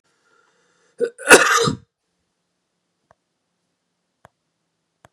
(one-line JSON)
{"cough_length": "5.1 s", "cough_amplitude": 32768, "cough_signal_mean_std_ratio": 0.22, "survey_phase": "beta (2021-08-13 to 2022-03-07)", "age": "45-64", "gender": "Male", "wearing_mask": "No", "symptom_cough_any": true, "symptom_runny_or_blocked_nose": true, "symptom_shortness_of_breath": true, "symptom_sore_throat": true, "symptom_fatigue": true, "symptom_headache": true, "smoker_status": "Ex-smoker", "respiratory_condition_asthma": false, "respiratory_condition_other": false, "recruitment_source": "Test and Trace", "submission_delay": "2 days", "covid_test_result": "Positive", "covid_test_method": "RT-qPCR", "covid_ct_value": 26.3, "covid_ct_gene": "N gene"}